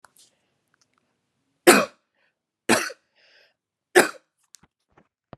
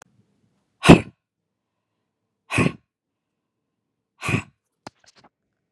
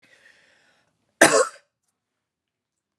{
  "three_cough_length": "5.4 s",
  "three_cough_amplitude": 32767,
  "three_cough_signal_mean_std_ratio": 0.21,
  "exhalation_length": "5.7 s",
  "exhalation_amplitude": 32768,
  "exhalation_signal_mean_std_ratio": 0.18,
  "cough_length": "3.0 s",
  "cough_amplitude": 32768,
  "cough_signal_mean_std_ratio": 0.22,
  "survey_phase": "beta (2021-08-13 to 2022-03-07)",
  "age": "45-64",
  "gender": "Female",
  "wearing_mask": "No",
  "symptom_cough_any": true,
  "symptom_runny_or_blocked_nose": true,
  "symptom_sore_throat": true,
  "symptom_headache": true,
  "symptom_change_to_sense_of_smell_or_taste": true,
  "symptom_loss_of_taste": true,
  "symptom_onset": "4 days",
  "smoker_status": "Ex-smoker",
  "respiratory_condition_asthma": false,
  "respiratory_condition_other": false,
  "recruitment_source": "Test and Trace",
  "submission_delay": "2 days",
  "covid_test_result": "Positive",
  "covid_test_method": "RT-qPCR",
  "covid_ct_value": 27.9,
  "covid_ct_gene": "E gene"
}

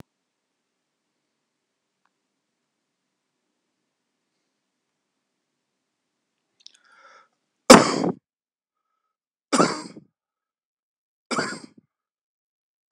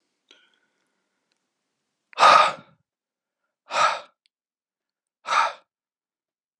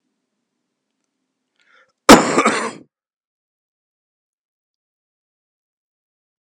{
  "three_cough_length": "12.9 s",
  "three_cough_amplitude": 32768,
  "three_cough_signal_mean_std_ratio": 0.15,
  "exhalation_length": "6.6 s",
  "exhalation_amplitude": 26711,
  "exhalation_signal_mean_std_ratio": 0.25,
  "cough_length": "6.4 s",
  "cough_amplitude": 32768,
  "cough_signal_mean_std_ratio": 0.19,
  "survey_phase": "beta (2021-08-13 to 2022-03-07)",
  "age": "45-64",
  "gender": "Male",
  "wearing_mask": "No",
  "symptom_none": true,
  "smoker_status": "Never smoked",
  "respiratory_condition_asthma": false,
  "respiratory_condition_other": false,
  "recruitment_source": "REACT",
  "submission_delay": "1 day",
  "covid_test_result": "Negative",
  "covid_test_method": "RT-qPCR"
}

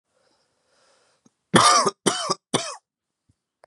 {
  "three_cough_length": "3.7 s",
  "three_cough_amplitude": 29859,
  "three_cough_signal_mean_std_ratio": 0.33,
  "survey_phase": "beta (2021-08-13 to 2022-03-07)",
  "age": "18-44",
  "gender": "Male",
  "wearing_mask": "No",
  "symptom_sore_throat": true,
  "symptom_onset": "3 days",
  "smoker_status": "Current smoker (1 to 10 cigarettes per day)",
  "respiratory_condition_asthma": false,
  "respiratory_condition_other": false,
  "recruitment_source": "Test and Trace",
  "submission_delay": "2 days",
  "covid_test_result": "Positive",
  "covid_test_method": "RT-qPCR",
  "covid_ct_value": 25.0,
  "covid_ct_gene": "N gene"
}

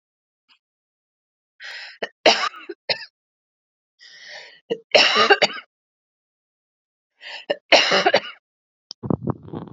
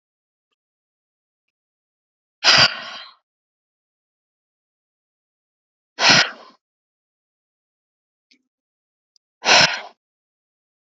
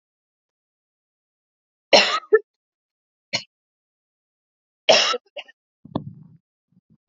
{
  "three_cough_length": "9.7 s",
  "three_cough_amplitude": 31691,
  "three_cough_signal_mean_std_ratio": 0.32,
  "exhalation_length": "10.9 s",
  "exhalation_amplitude": 32768,
  "exhalation_signal_mean_std_ratio": 0.22,
  "cough_length": "7.1 s",
  "cough_amplitude": 28712,
  "cough_signal_mean_std_ratio": 0.23,
  "survey_phase": "alpha (2021-03-01 to 2021-08-12)",
  "age": "18-44",
  "gender": "Female",
  "wearing_mask": "No",
  "symptom_abdominal_pain": true,
  "symptom_fatigue": true,
  "symptom_headache": true,
  "symptom_onset": "12 days",
  "smoker_status": "Never smoked",
  "respiratory_condition_asthma": false,
  "respiratory_condition_other": false,
  "recruitment_source": "REACT",
  "submission_delay": "1 day",
  "covid_test_result": "Negative",
  "covid_test_method": "RT-qPCR"
}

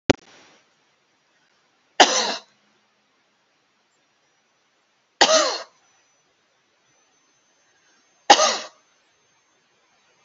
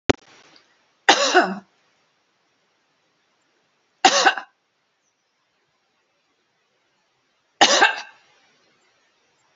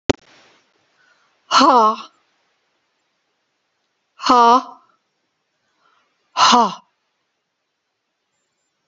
{
  "three_cough_length": "10.2 s",
  "three_cough_amplitude": 31209,
  "three_cough_signal_mean_std_ratio": 0.22,
  "cough_length": "9.6 s",
  "cough_amplitude": 32679,
  "cough_signal_mean_std_ratio": 0.25,
  "exhalation_length": "8.9 s",
  "exhalation_amplitude": 31105,
  "exhalation_signal_mean_std_ratio": 0.29,
  "survey_phase": "alpha (2021-03-01 to 2021-08-12)",
  "age": "65+",
  "gender": "Female",
  "wearing_mask": "No",
  "symptom_none": true,
  "smoker_status": "Never smoked",
  "respiratory_condition_asthma": false,
  "respiratory_condition_other": false,
  "recruitment_source": "REACT",
  "submission_delay": "2 days",
  "covid_test_result": "Negative",
  "covid_test_method": "RT-qPCR"
}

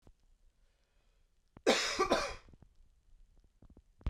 {
  "cough_length": "4.1 s",
  "cough_amplitude": 6555,
  "cough_signal_mean_std_ratio": 0.33,
  "survey_phase": "beta (2021-08-13 to 2022-03-07)",
  "age": "18-44",
  "gender": "Male",
  "wearing_mask": "No",
  "symptom_runny_or_blocked_nose": true,
  "symptom_fatigue": true,
  "symptom_headache": true,
  "symptom_loss_of_taste": true,
  "symptom_onset": "2 days",
  "smoker_status": "Never smoked",
  "respiratory_condition_asthma": false,
  "respiratory_condition_other": true,
  "recruitment_source": "Test and Trace",
  "submission_delay": "1 day",
  "covid_test_result": "Positive",
  "covid_test_method": "ePCR"
}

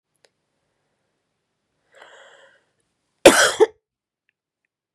{
  "cough_length": "4.9 s",
  "cough_amplitude": 32768,
  "cough_signal_mean_std_ratio": 0.19,
  "survey_phase": "beta (2021-08-13 to 2022-03-07)",
  "age": "45-64",
  "gender": "Female",
  "wearing_mask": "No",
  "symptom_cough_any": true,
  "symptom_runny_or_blocked_nose": true,
  "smoker_status": "Never smoked",
  "respiratory_condition_asthma": false,
  "respiratory_condition_other": false,
  "recruitment_source": "Test and Trace",
  "submission_delay": "1 day",
  "covid_test_result": "Positive",
  "covid_test_method": "RT-qPCR",
  "covid_ct_value": 30.2,
  "covid_ct_gene": "N gene"
}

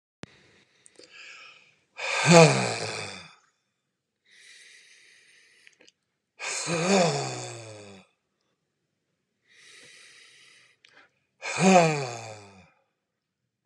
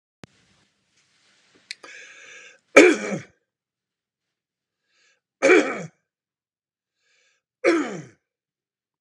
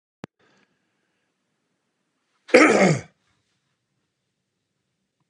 {
  "exhalation_length": "13.7 s",
  "exhalation_amplitude": 31592,
  "exhalation_signal_mean_std_ratio": 0.31,
  "three_cough_length": "9.0 s",
  "three_cough_amplitude": 32767,
  "three_cough_signal_mean_std_ratio": 0.23,
  "cough_length": "5.3 s",
  "cough_amplitude": 32729,
  "cough_signal_mean_std_ratio": 0.23,
  "survey_phase": "beta (2021-08-13 to 2022-03-07)",
  "age": "65+",
  "gender": "Male",
  "wearing_mask": "No",
  "symptom_none": true,
  "smoker_status": "Ex-smoker",
  "respiratory_condition_asthma": false,
  "respiratory_condition_other": false,
  "recruitment_source": "REACT",
  "submission_delay": "0 days",
  "covid_test_result": "Positive",
  "covid_test_method": "RT-qPCR",
  "covid_ct_value": 24.0,
  "covid_ct_gene": "N gene",
  "influenza_a_test_result": "Negative",
  "influenza_b_test_result": "Negative"
}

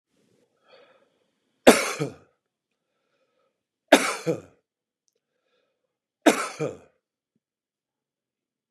{
  "three_cough_length": "8.7 s",
  "three_cough_amplitude": 32768,
  "three_cough_signal_mean_std_ratio": 0.2,
  "survey_phase": "beta (2021-08-13 to 2022-03-07)",
  "age": "65+",
  "gender": "Male",
  "wearing_mask": "No",
  "symptom_none": true,
  "smoker_status": "Ex-smoker",
  "respiratory_condition_asthma": false,
  "respiratory_condition_other": false,
  "recruitment_source": "REACT",
  "submission_delay": "1 day",
  "covid_test_result": "Negative",
  "covid_test_method": "RT-qPCR",
  "influenza_a_test_result": "Unknown/Void",
  "influenza_b_test_result": "Unknown/Void"
}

